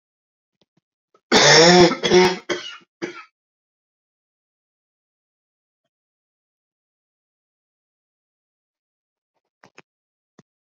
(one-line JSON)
{"cough_length": "10.7 s", "cough_amplitude": 32374, "cough_signal_mean_std_ratio": 0.25, "survey_phase": "alpha (2021-03-01 to 2021-08-12)", "age": "45-64", "gender": "Male", "wearing_mask": "No", "symptom_cough_any": true, "symptom_shortness_of_breath": true, "symptom_fatigue": true, "symptom_fever_high_temperature": true, "symptom_headache": true, "symptom_change_to_sense_of_smell_or_taste": true, "symptom_loss_of_taste": true, "smoker_status": "Never smoked", "respiratory_condition_asthma": false, "respiratory_condition_other": false, "recruitment_source": "Test and Trace", "submission_delay": "2 days", "covid_test_result": "Positive", "covid_test_method": "LFT"}